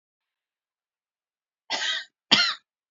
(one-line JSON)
{"cough_length": "2.9 s", "cough_amplitude": 29656, "cough_signal_mean_std_ratio": 0.3, "survey_phase": "alpha (2021-03-01 to 2021-08-12)", "age": "18-44", "gender": "Female", "wearing_mask": "No", "symptom_none": true, "symptom_onset": "12 days", "smoker_status": "Never smoked", "respiratory_condition_asthma": false, "respiratory_condition_other": false, "recruitment_source": "REACT", "submission_delay": "9 days", "covid_test_result": "Negative", "covid_test_method": "RT-qPCR"}